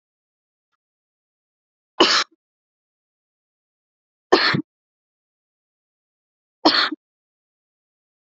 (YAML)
three_cough_length: 8.3 s
three_cough_amplitude: 32767
three_cough_signal_mean_std_ratio: 0.22
survey_phase: beta (2021-08-13 to 2022-03-07)
age: 18-44
gender: Female
wearing_mask: 'No'
symptom_none: true
smoker_status: Never smoked
respiratory_condition_asthma: false
respiratory_condition_other: false
recruitment_source: REACT
submission_delay: 0 days
covid_test_result: Negative
covid_test_method: RT-qPCR
influenza_a_test_result: Negative
influenza_b_test_result: Negative